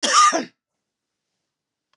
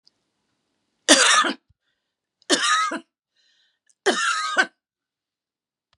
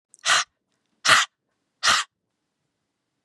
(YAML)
cough_length: 2.0 s
cough_amplitude: 24465
cough_signal_mean_std_ratio: 0.35
three_cough_length: 6.0 s
three_cough_amplitude: 32672
three_cough_signal_mean_std_ratio: 0.37
exhalation_length: 3.2 s
exhalation_amplitude: 28537
exhalation_signal_mean_std_ratio: 0.33
survey_phase: beta (2021-08-13 to 2022-03-07)
age: 65+
gender: Female
wearing_mask: 'No'
symptom_none: true
smoker_status: Ex-smoker
respiratory_condition_asthma: false
respiratory_condition_other: false
recruitment_source: REACT
submission_delay: 1 day
covid_test_result: Negative
covid_test_method: RT-qPCR
influenza_a_test_result: Negative
influenza_b_test_result: Negative